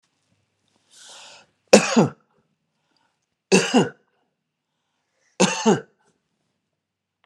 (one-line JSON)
{"three_cough_length": "7.3 s", "three_cough_amplitude": 32768, "three_cough_signal_mean_std_ratio": 0.26, "survey_phase": "beta (2021-08-13 to 2022-03-07)", "age": "65+", "gender": "Male", "wearing_mask": "No", "symptom_runny_or_blocked_nose": true, "symptom_abdominal_pain": true, "symptom_onset": "11 days", "smoker_status": "Never smoked", "respiratory_condition_asthma": false, "respiratory_condition_other": false, "recruitment_source": "REACT", "submission_delay": "2 days", "covid_test_result": "Negative", "covid_test_method": "RT-qPCR"}